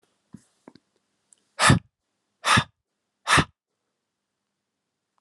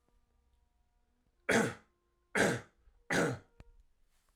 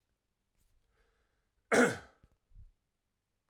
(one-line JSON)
{"exhalation_length": "5.2 s", "exhalation_amplitude": 19866, "exhalation_signal_mean_std_ratio": 0.25, "three_cough_length": "4.4 s", "three_cough_amplitude": 5264, "three_cough_signal_mean_std_ratio": 0.34, "cough_length": "3.5 s", "cough_amplitude": 7452, "cough_signal_mean_std_ratio": 0.21, "survey_phase": "alpha (2021-03-01 to 2021-08-12)", "age": "18-44", "gender": "Male", "wearing_mask": "No", "symptom_cough_any": true, "symptom_fatigue": true, "symptom_fever_high_temperature": true, "symptom_onset": "3 days", "smoker_status": "Never smoked", "respiratory_condition_asthma": false, "respiratory_condition_other": false, "recruitment_source": "Test and Trace", "submission_delay": "2 days", "covid_test_result": "Positive", "covid_test_method": "RT-qPCR", "covid_ct_value": 17.6, "covid_ct_gene": "ORF1ab gene"}